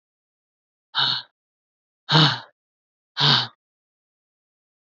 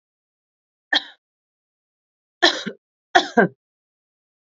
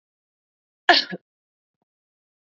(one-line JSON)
{"exhalation_length": "4.9 s", "exhalation_amplitude": 31020, "exhalation_signal_mean_std_ratio": 0.31, "three_cough_length": "4.5 s", "three_cough_amplitude": 28403, "three_cough_signal_mean_std_ratio": 0.23, "cough_length": "2.6 s", "cough_amplitude": 28214, "cough_signal_mean_std_ratio": 0.18, "survey_phase": "beta (2021-08-13 to 2022-03-07)", "age": "45-64", "gender": "Female", "wearing_mask": "No", "symptom_cough_any": true, "symptom_runny_or_blocked_nose": true, "symptom_sore_throat": true, "symptom_fatigue": true, "symptom_headache": true, "symptom_change_to_sense_of_smell_or_taste": true, "symptom_other": true, "symptom_onset": "2 days", "smoker_status": "Never smoked", "respiratory_condition_asthma": false, "respiratory_condition_other": false, "recruitment_source": "Test and Trace", "submission_delay": "1 day", "covid_test_result": "Positive", "covid_test_method": "RT-qPCR", "covid_ct_value": 23.6, "covid_ct_gene": "ORF1ab gene", "covid_ct_mean": 24.0, "covid_viral_load": "13000 copies/ml", "covid_viral_load_category": "Low viral load (10K-1M copies/ml)"}